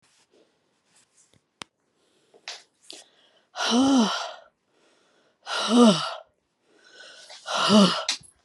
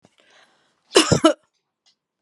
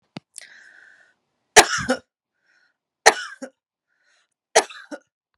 {"exhalation_length": "8.4 s", "exhalation_amplitude": 19191, "exhalation_signal_mean_std_ratio": 0.38, "cough_length": "2.2 s", "cough_amplitude": 32767, "cough_signal_mean_std_ratio": 0.27, "three_cough_length": "5.4 s", "three_cough_amplitude": 32768, "three_cough_signal_mean_std_ratio": 0.21, "survey_phase": "beta (2021-08-13 to 2022-03-07)", "age": "45-64", "gender": "Female", "wearing_mask": "No", "symptom_none": true, "smoker_status": "Never smoked", "respiratory_condition_asthma": false, "respiratory_condition_other": false, "recruitment_source": "REACT", "submission_delay": "1 day", "covid_test_result": "Negative", "covid_test_method": "RT-qPCR"}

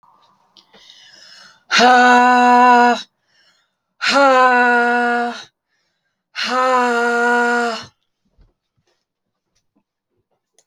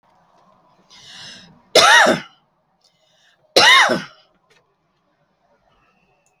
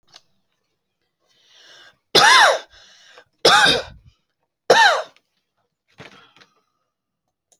{"exhalation_length": "10.7 s", "exhalation_amplitude": 31803, "exhalation_signal_mean_std_ratio": 0.55, "cough_length": "6.4 s", "cough_amplitude": 30424, "cough_signal_mean_std_ratio": 0.31, "three_cough_length": "7.6 s", "three_cough_amplitude": 31634, "three_cough_signal_mean_std_ratio": 0.32, "survey_phase": "alpha (2021-03-01 to 2021-08-12)", "age": "45-64", "gender": "Female", "wearing_mask": "No", "symptom_none": true, "symptom_onset": "5 days", "smoker_status": "Never smoked", "respiratory_condition_asthma": false, "respiratory_condition_other": false, "recruitment_source": "REACT", "submission_delay": "2 days", "covid_test_result": "Negative", "covid_test_method": "RT-qPCR"}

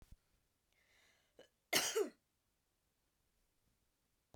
{"cough_length": "4.4 s", "cough_amplitude": 3436, "cough_signal_mean_std_ratio": 0.23, "survey_phase": "beta (2021-08-13 to 2022-03-07)", "age": "45-64", "gender": "Female", "wearing_mask": "No", "symptom_cough_any": true, "symptom_runny_or_blocked_nose": true, "symptom_sore_throat": true, "symptom_diarrhoea": true, "symptom_fatigue": true, "symptom_headache": true, "symptom_other": true, "smoker_status": "Current smoker (e-cigarettes or vapes only)", "respiratory_condition_asthma": false, "respiratory_condition_other": false, "recruitment_source": "Test and Trace", "submission_delay": "1 day", "covid_test_result": "Positive", "covid_test_method": "LFT"}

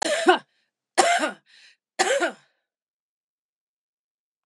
{"three_cough_length": "4.5 s", "three_cough_amplitude": 25636, "three_cough_signal_mean_std_ratio": 0.35, "survey_phase": "beta (2021-08-13 to 2022-03-07)", "age": "45-64", "gender": "Female", "wearing_mask": "No", "symptom_none": true, "smoker_status": "Never smoked", "respiratory_condition_asthma": false, "respiratory_condition_other": false, "recruitment_source": "REACT", "submission_delay": "1 day", "covid_test_result": "Negative", "covid_test_method": "RT-qPCR", "influenza_a_test_result": "Negative", "influenza_b_test_result": "Negative"}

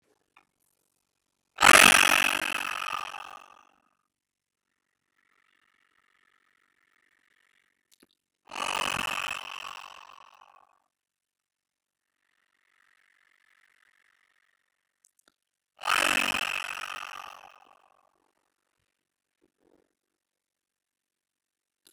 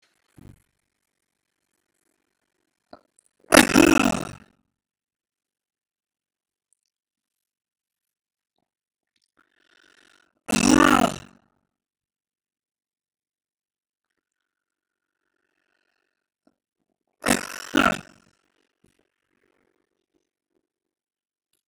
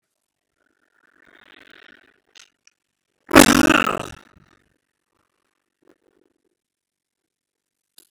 {"exhalation_length": "21.9 s", "exhalation_amplitude": 31866, "exhalation_signal_mean_std_ratio": 0.19, "three_cough_length": "21.7 s", "three_cough_amplitude": 32767, "three_cough_signal_mean_std_ratio": 0.16, "cough_length": "8.1 s", "cough_amplitude": 32768, "cough_signal_mean_std_ratio": 0.16, "survey_phase": "beta (2021-08-13 to 2022-03-07)", "age": "65+", "gender": "Male", "wearing_mask": "No", "symptom_cough_any": true, "symptom_runny_or_blocked_nose": true, "symptom_sore_throat": true, "symptom_abdominal_pain": true, "symptom_fatigue": true, "symptom_fever_high_temperature": true, "symptom_headache": true, "smoker_status": "Ex-smoker", "respiratory_condition_asthma": false, "respiratory_condition_other": true, "recruitment_source": "Test and Trace", "submission_delay": "1 day", "covid_test_result": "Positive", "covid_test_method": "LFT"}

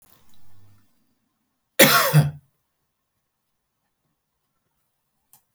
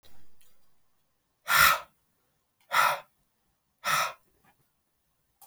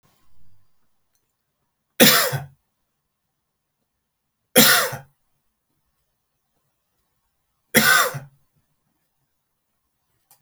{"cough_length": "5.5 s", "cough_amplitude": 32768, "cough_signal_mean_std_ratio": 0.24, "exhalation_length": "5.5 s", "exhalation_amplitude": 16169, "exhalation_signal_mean_std_ratio": 0.32, "three_cough_length": "10.4 s", "three_cough_amplitude": 32768, "three_cough_signal_mean_std_ratio": 0.26, "survey_phase": "beta (2021-08-13 to 2022-03-07)", "age": "18-44", "gender": "Male", "wearing_mask": "No", "symptom_none": true, "smoker_status": "Never smoked", "respiratory_condition_asthma": false, "respiratory_condition_other": false, "recruitment_source": "REACT", "submission_delay": "2 days", "covid_test_result": "Negative", "covid_test_method": "RT-qPCR"}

